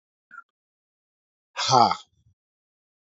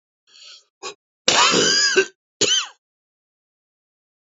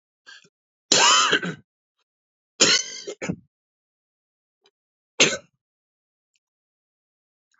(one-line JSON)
{"exhalation_length": "3.2 s", "exhalation_amplitude": 23764, "exhalation_signal_mean_std_ratio": 0.24, "cough_length": "4.3 s", "cough_amplitude": 32612, "cough_signal_mean_std_ratio": 0.41, "three_cough_length": "7.6 s", "three_cough_amplitude": 27250, "three_cough_signal_mean_std_ratio": 0.29, "survey_phase": "beta (2021-08-13 to 2022-03-07)", "age": "45-64", "gender": "Male", "wearing_mask": "No", "symptom_cough_any": true, "symptom_runny_or_blocked_nose": true, "symptom_fatigue": true, "symptom_headache": true, "symptom_change_to_sense_of_smell_or_taste": true, "smoker_status": "Never smoked", "respiratory_condition_asthma": false, "respiratory_condition_other": false, "recruitment_source": "Test and Trace", "submission_delay": "1 day", "covid_test_result": "Positive", "covid_test_method": "RT-qPCR", "covid_ct_value": 18.4, "covid_ct_gene": "ORF1ab gene"}